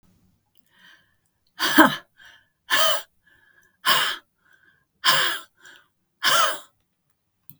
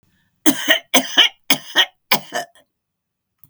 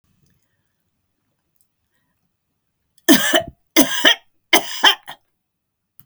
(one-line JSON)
{"exhalation_length": "7.6 s", "exhalation_amplitude": 32768, "exhalation_signal_mean_std_ratio": 0.36, "cough_length": "3.5 s", "cough_amplitude": 32768, "cough_signal_mean_std_ratio": 0.36, "three_cough_length": "6.1 s", "three_cough_amplitude": 32768, "three_cough_signal_mean_std_ratio": 0.29, "survey_phase": "beta (2021-08-13 to 2022-03-07)", "age": "65+", "gender": "Female", "wearing_mask": "No", "symptom_none": true, "smoker_status": "Never smoked", "respiratory_condition_asthma": false, "respiratory_condition_other": false, "recruitment_source": "REACT", "submission_delay": "1 day", "covid_test_result": "Negative", "covid_test_method": "RT-qPCR", "influenza_a_test_result": "Negative", "influenza_b_test_result": "Negative"}